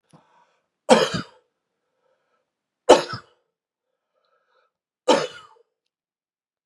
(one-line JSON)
{"three_cough_length": "6.7 s", "three_cough_amplitude": 32767, "three_cough_signal_mean_std_ratio": 0.21, "survey_phase": "beta (2021-08-13 to 2022-03-07)", "age": "65+", "gender": "Male", "wearing_mask": "No", "symptom_cough_any": true, "symptom_runny_or_blocked_nose": true, "symptom_fatigue": true, "symptom_fever_high_temperature": true, "symptom_headache": true, "symptom_change_to_sense_of_smell_or_taste": true, "symptom_loss_of_taste": true, "symptom_onset": "4 days", "smoker_status": "Ex-smoker", "respiratory_condition_asthma": false, "respiratory_condition_other": false, "recruitment_source": "Test and Trace", "submission_delay": "1 day", "covid_test_result": "Positive", "covid_test_method": "ePCR"}